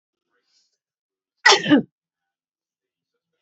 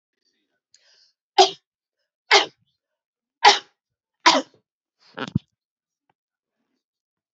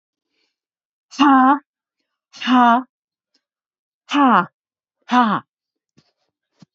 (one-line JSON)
{"cough_length": "3.4 s", "cough_amplitude": 32768, "cough_signal_mean_std_ratio": 0.23, "three_cough_length": "7.3 s", "three_cough_amplitude": 32299, "three_cough_signal_mean_std_ratio": 0.21, "exhalation_length": "6.7 s", "exhalation_amplitude": 28893, "exhalation_signal_mean_std_ratio": 0.36, "survey_phase": "beta (2021-08-13 to 2022-03-07)", "age": "65+", "gender": "Female", "wearing_mask": "No", "symptom_none": true, "smoker_status": "Never smoked", "respiratory_condition_asthma": false, "respiratory_condition_other": false, "recruitment_source": "REACT", "submission_delay": "4 days", "covid_test_result": "Negative", "covid_test_method": "RT-qPCR", "influenza_a_test_result": "Negative", "influenza_b_test_result": "Negative"}